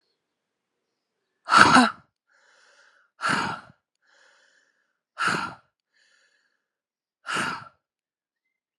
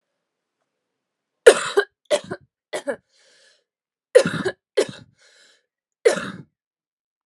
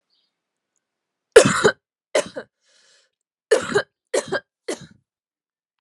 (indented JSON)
{
  "exhalation_length": "8.8 s",
  "exhalation_amplitude": 32768,
  "exhalation_signal_mean_std_ratio": 0.26,
  "cough_length": "7.3 s",
  "cough_amplitude": 32768,
  "cough_signal_mean_std_ratio": 0.24,
  "three_cough_length": "5.8 s",
  "three_cough_amplitude": 32768,
  "three_cough_signal_mean_std_ratio": 0.26,
  "survey_phase": "alpha (2021-03-01 to 2021-08-12)",
  "age": "18-44",
  "gender": "Female",
  "wearing_mask": "No",
  "symptom_cough_any": true,
  "symptom_new_continuous_cough": true,
  "symptom_shortness_of_breath": true,
  "symptom_fatigue": true,
  "symptom_fever_high_temperature": true,
  "symptom_headache": true,
  "symptom_change_to_sense_of_smell_or_taste": true,
  "symptom_onset": "5 days",
  "smoker_status": "Prefer not to say",
  "respiratory_condition_asthma": false,
  "respiratory_condition_other": false,
  "recruitment_source": "Test and Trace",
  "submission_delay": "2 days",
  "covid_test_result": "Positive",
  "covid_test_method": "RT-qPCR",
  "covid_ct_value": 10.3,
  "covid_ct_gene": "ORF1ab gene",
  "covid_ct_mean": 10.5,
  "covid_viral_load": "360000000 copies/ml",
  "covid_viral_load_category": "High viral load (>1M copies/ml)"
}